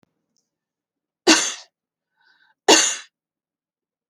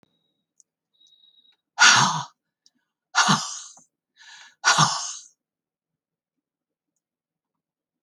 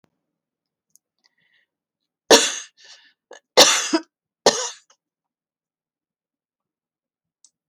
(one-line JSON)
{"cough_length": "4.1 s", "cough_amplitude": 32767, "cough_signal_mean_std_ratio": 0.26, "exhalation_length": "8.0 s", "exhalation_amplitude": 27733, "exhalation_signal_mean_std_ratio": 0.29, "three_cough_length": "7.7 s", "three_cough_amplitude": 30763, "three_cough_signal_mean_std_ratio": 0.22, "survey_phase": "alpha (2021-03-01 to 2021-08-12)", "age": "65+", "gender": "Female", "wearing_mask": "No", "symptom_none": true, "smoker_status": "Never smoked", "respiratory_condition_asthma": true, "respiratory_condition_other": false, "recruitment_source": "REACT", "submission_delay": "1 day", "covid_test_result": "Negative", "covid_test_method": "RT-qPCR"}